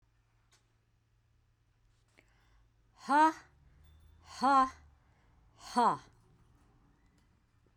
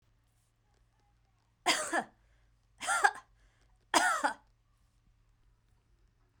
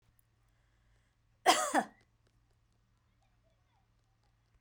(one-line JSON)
{"exhalation_length": "7.8 s", "exhalation_amplitude": 5117, "exhalation_signal_mean_std_ratio": 0.28, "three_cough_length": "6.4 s", "three_cough_amplitude": 11000, "three_cough_signal_mean_std_ratio": 0.3, "cough_length": "4.6 s", "cough_amplitude": 8566, "cough_signal_mean_std_ratio": 0.21, "survey_phase": "beta (2021-08-13 to 2022-03-07)", "age": "45-64", "gender": "Female", "wearing_mask": "No", "symptom_none": true, "smoker_status": "Never smoked", "respiratory_condition_asthma": false, "respiratory_condition_other": false, "recruitment_source": "REACT", "submission_delay": "4 days", "covid_test_result": "Negative", "covid_test_method": "RT-qPCR"}